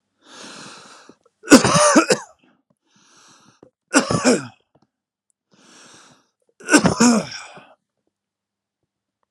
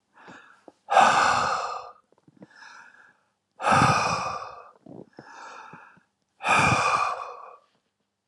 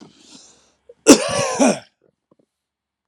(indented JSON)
{
  "three_cough_length": "9.3 s",
  "three_cough_amplitude": 32768,
  "three_cough_signal_mean_std_ratio": 0.31,
  "exhalation_length": "8.3 s",
  "exhalation_amplitude": 17941,
  "exhalation_signal_mean_std_ratio": 0.46,
  "cough_length": "3.1 s",
  "cough_amplitude": 32768,
  "cough_signal_mean_std_ratio": 0.31,
  "survey_phase": "alpha (2021-03-01 to 2021-08-12)",
  "age": "45-64",
  "gender": "Male",
  "wearing_mask": "No",
  "symptom_none": true,
  "smoker_status": "Never smoked",
  "respiratory_condition_asthma": false,
  "respiratory_condition_other": false,
  "recruitment_source": "Test and Trace",
  "submission_delay": "1 day",
  "covid_test_result": "Negative",
  "covid_test_method": "LFT"
}